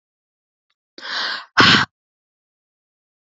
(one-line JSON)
{"exhalation_length": "3.3 s", "exhalation_amplitude": 31457, "exhalation_signal_mean_std_ratio": 0.29, "survey_phase": "beta (2021-08-13 to 2022-03-07)", "age": "18-44", "gender": "Female", "wearing_mask": "No", "symptom_fatigue": true, "symptom_headache": true, "symptom_other": true, "smoker_status": "Never smoked", "respiratory_condition_asthma": true, "respiratory_condition_other": false, "recruitment_source": "REACT", "submission_delay": "1 day", "covid_test_result": "Negative", "covid_test_method": "RT-qPCR", "covid_ct_value": 38.0, "covid_ct_gene": "N gene", "influenza_a_test_result": "Negative", "influenza_b_test_result": "Negative"}